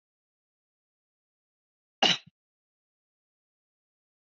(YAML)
cough_length: 4.3 s
cough_amplitude: 12268
cough_signal_mean_std_ratio: 0.14
survey_phase: beta (2021-08-13 to 2022-03-07)
age: 18-44
gender: Male
wearing_mask: 'No'
symptom_none: true
smoker_status: Never smoked
respiratory_condition_asthma: false
respiratory_condition_other: false
recruitment_source: REACT
submission_delay: 2 days
covid_test_result: Negative
covid_test_method: RT-qPCR